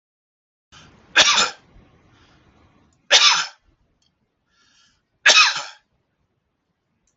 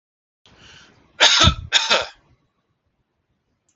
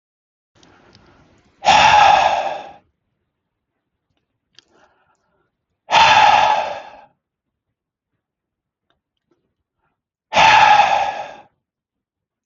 {"three_cough_length": "7.2 s", "three_cough_amplitude": 32768, "three_cough_signal_mean_std_ratio": 0.29, "cough_length": "3.8 s", "cough_amplitude": 30380, "cough_signal_mean_std_ratio": 0.32, "exhalation_length": "12.5 s", "exhalation_amplitude": 30076, "exhalation_signal_mean_std_ratio": 0.37, "survey_phase": "alpha (2021-03-01 to 2021-08-12)", "age": "45-64", "gender": "Male", "wearing_mask": "No", "symptom_none": true, "symptom_onset": "12 days", "smoker_status": "Never smoked", "respiratory_condition_asthma": false, "respiratory_condition_other": false, "recruitment_source": "REACT", "submission_delay": "1 day", "covid_test_result": "Negative", "covid_test_method": "RT-qPCR"}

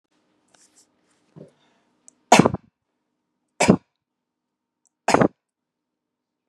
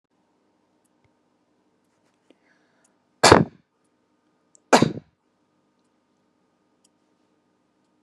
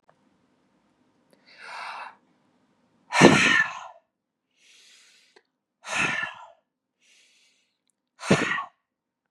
{"three_cough_length": "6.5 s", "three_cough_amplitude": 32767, "three_cough_signal_mean_std_ratio": 0.19, "cough_length": "8.0 s", "cough_amplitude": 32768, "cough_signal_mean_std_ratio": 0.16, "exhalation_length": "9.3 s", "exhalation_amplitude": 32767, "exhalation_signal_mean_std_ratio": 0.28, "survey_phase": "beta (2021-08-13 to 2022-03-07)", "age": "45-64", "gender": "Female", "wearing_mask": "No", "symptom_none": true, "smoker_status": "Never smoked", "respiratory_condition_asthma": false, "respiratory_condition_other": false, "recruitment_source": "REACT", "submission_delay": "5 days", "covid_test_result": "Negative", "covid_test_method": "RT-qPCR", "influenza_a_test_result": "Negative", "influenza_b_test_result": "Negative"}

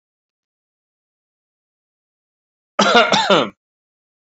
{"cough_length": "4.3 s", "cough_amplitude": 32768, "cough_signal_mean_std_ratio": 0.3, "survey_phase": "beta (2021-08-13 to 2022-03-07)", "age": "18-44", "gender": "Male", "wearing_mask": "No", "symptom_none": true, "smoker_status": "Never smoked", "respiratory_condition_asthma": false, "respiratory_condition_other": false, "recruitment_source": "REACT", "submission_delay": "1 day", "covid_test_result": "Negative", "covid_test_method": "RT-qPCR", "influenza_a_test_result": "Negative", "influenza_b_test_result": "Negative"}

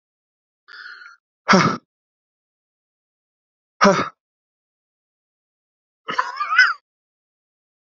{"exhalation_length": "7.9 s", "exhalation_amplitude": 30781, "exhalation_signal_mean_std_ratio": 0.26, "survey_phase": "beta (2021-08-13 to 2022-03-07)", "age": "45-64", "gender": "Male", "wearing_mask": "No", "symptom_cough_any": true, "symptom_runny_or_blocked_nose": true, "symptom_diarrhoea": true, "symptom_fever_high_temperature": true, "symptom_headache": true, "symptom_change_to_sense_of_smell_or_taste": true, "symptom_loss_of_taste": true, "symptom_onset": "3 days", "smoker_status": "Ex-smoker", "respiratory_condition_asthma": false, "respiratory_condition_other": false, "recruitment_source": "Test and Trace", "submission_delay": "2 days", "covid_test_result": "Positive", "covid_test_method": "RT-qPCR", "covid_ct_value": 20.7, "covid_ct_gene": "ORF1ab gene"}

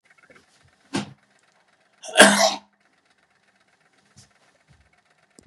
{"cough_length": "5.5 s", "cough_amplitude": 32768, "cough_signal_mean_std_ratio": 0.21, "survey_phase": "beta (2021-08-13 to 2022-03-07)", "age": "65+", "gender": "Male", "wearing_mask": "No", "symptom_cough_any": true, "symptom_runny_or_blocked_nose": true, "symptom_sore_throat": true, "symptom_onset": "3 days", "smoker_status": "Never smoked", "respiratory_condition_asthma": false, "respiratory_condition_other": false, "recruitment_source": "REACT", "submission_delay": "2 days", "covid_test_result": "Positive", "covid_test_method": "RT-qPCR", "covid_ct_value": 15.0, "covid_ct_gene": "E gene", "influenza_a_test_result": "Negative", "influenza_b_test_result": "Negative"}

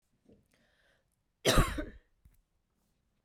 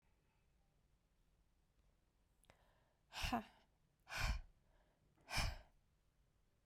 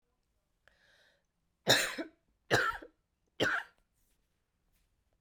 {"cough_length": "3.2 s", "cough_amplitude": 9361, "cough_signal_mean_std_ratio": 0.25, "exhalation_length": "6.7 s", "exhalation_amplitude": 1449, "exhalation_signal_mean_std_ratio": 0.32, "three_cough_length": "5.2 s", "three_cough_amplitude": 9066, "three_cough_signal_mean_std_ratio": 0.3, "survey_phase": "beta (2021-08-13 to 2022-03-07)", "age": "18-44", "gender": "Female", "wearing_mask": "No", "symptom_cough_any": true, "symptom_runny_or_blocked_nose": true, "symptom_sore_throat": true, "symptom_fatigue": true, "symptom_headache": true, "symptom_change_to_sense_of_smell_or_taste": true, "symptom_other": true, "symptom_onset": "5 days", "smoker_status": "Never smoked", "respiratory_condition_asthma": false, "respiratory_condition_other": false, "recruitment_source": "Test and Trace", "submission_delay": "2 days", "covid_test_result": "Positive", "covid_test_method": "RT-qPCR"}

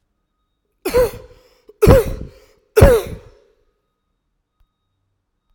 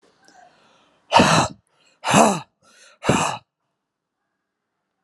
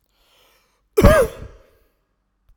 {"three_cough_length": "5.5 s", "three_cough_amplitude": 32768, "three_cough_signal_mean_std_ratio": 0.3, "exhalation_length": "5.0 s", "exhalation_amplitude": 30940, "exhalation_signal_mean_std_ratio": 0.34, "cough_length": "2.6 s", "cough_amplitude": 32768, "cough_signal_mean_std_ratio": 0.28, "survey_phase": "alpha (2021-03-01 to 2021-08-12)", "age": "45-64", "gender": "Male", "wearing_mask": "No", "symptom_none": true, "smoker_status": "Ex-smoker", "respiratory_condition_asthma": false, "respiratory_condition_other": false, "recruitment_source": "REACT", "submission_delay": "1 day", "covid_test_result": "Negative", "covid_test_method": "RT-qPCR"}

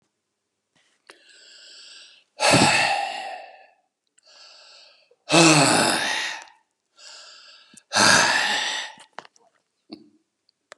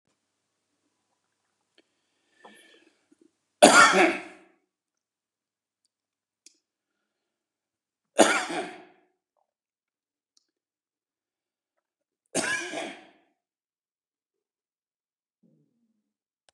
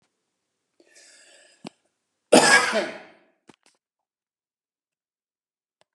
{"exhalation_length": "10.8 s", "exhalation_amplitude": 28098, "exhalation_signal_mean_std_ratio": 0.41, "three_cough_length": "16.5 s", "three_cough_amplitude": 31250, "three_cough_signal_mean_std_ratio": 0.19, "cough_length": "5.9 s", "cough_amplitude": 30656, "cough_signal_mean_std_ratio": 0.22, "survey_phase": "beta (2021-08-13 to 2022-03-07)", "age": "45-64", "gender": "Male", "wearing_mask": "No", "symptom_none": true, "symptom_onset": "12 days", "smoker_status": "Ex-smoker", "respiratory_condition_asthma": false, "respiratory_condition_other": false, "recruitment_source": "REACT", "submission_delay": "6 days", "covid_test_result": "Negative", "covid_test_method": "RT-qPCR", "influenza_a_test_result": "Negative", "influenza_b_test_result": "Negative"}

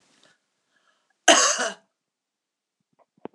{"cough_length": "3.3 s", "cough_amplitude": 26027, "cough_signal_mean_std_ratio": 0.25, "survey_phase": "beta (2021-08-13 to 2022-03-07)", "age": "45-64", "gender": "Female", "wearing_mask": "No", "symptom_none": true, "smoker_status": "Never smoked", "respiratory_condition_asthma": false, "respiratory_condition_other": false, "recruitment_source": "REACT", "submission_delay": "1 day", "covid_test_method": "RT-qPCR"}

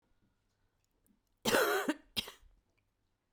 {"cough_length": "3.3 s", "cough_amplitude": 7496, "cough_signal_mean_std_ratio": 0.33, "survey_phase": "beta (2021-08-13 to 2022-03-07)", "age": "45-64", "gender": "Female", "wearing_mask": "No", "symptom_cough_any": true, "symptom_runny_or_blocked_nose": true, "symptom_shortness_of_breath": true, "symptom_abdominal_pain": true, "symptom_fatigue": true, "symptom_fever_high_temperature": true, "symptom_headache": true, "symptom_change_to_sense_of_smell_or_taste": true, "symptom_other": true, "symptom_onset": "4 days", "smoker_status": "Never smoked", "respiratory_condition_asthma": false, "respiratory_condition_other": false, "recruitment_source": "Test and Trace", "submission_delay": "2 days", "covid_test_result": "Positive", "covid_test_method": "RT-qPCR", "covid_ct_value": 20.6, "covid_ct_gene": "ORF1ab gene"}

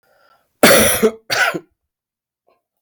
{"cough_length": "2.8 s", "cough_amplitude": 32767, "cough_signal_mean_std_ratio": 0.4, "survey_phase": "alpha (2021-03-01 to 2021-08-12)", "age": "45-64", "gender": "Male", "wearing_mask": "No", "symptom_cough_any": true, "symptom_fatigue": true, "symptom_fever_high_temperature": true, "symptom_change_to_sense_of_smell_or_taste": true, "symptom_loss_of_taste": true, "symptom_onset": "9 days", "smoker_status": "Never smoked", "respiratory_condition_asthma": false, "respiratory_condition_other": false, "recruitment_source": "Test and Trace", "submission_delay": "1 day", "covid_test_result": "Positive", "covid_test_method": "RT-qPCR"}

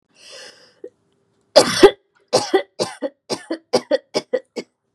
{"cough_length": "4.9 s", "cough_amplitude": 32768, "cough_signal_mean_std_ratio": 0.31, "survey_phase": "beta (2021-08-13 to 2022-03-07)", "age": "18-44", "gender": "Female", "wearing_mask": "No", "symptom_none": true, "smoker_status": "Never smoked", "respiratory_condition_asthma": false, "respiratory_condition_other": false, "recruitment_source": "REACT", "submission_delay": "1 day", "covid_test_result": "Negative", "covid_test_method": "RT-qPCR", "influenza_a_test_result": "Negative", "influenza_b_test_result": "Negative"}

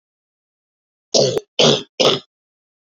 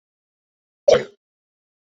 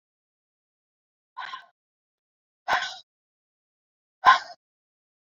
{"three_cough_length": "2.9 s", "three_cough_amplitude": 30339, "three_cough_signal_mean_std_ratio": 0.37, "cough_length": "1.9 s", "cough_amplitude": 26683, "cough_signal_mean_std_ratio": 0.2, "exhalation_length": "5.3 s", "exhalation_amplitude": 24779, "exhalation_signal_mean_std_ratio": 0.19, "survey_phase": "beta (2021-08-13 to 2022-03-07)", "age": "18-44", "gender": "Female", "wearing_mask": "No", "symptom_runny_or_blocked_nose": true, "smoker_status": "Ex-smoker", "respiratory_condition_asthma": false, "respiratory_condition_other": false, "recruitment_source": "Test and Trace", "submission_delay": "2 days", "covid_test_result": "Positive", "covid_test_method": "RT-qPCR", "covid_ct_value": 25.7, "covid_ct_gene": "ORF1ab gene", "covid_ct_mean": 26.2, "covid_viral_load": "2500 copies/ml", "covid_viral_load_category": "Minimal viral load (< 10K copies/ml)"}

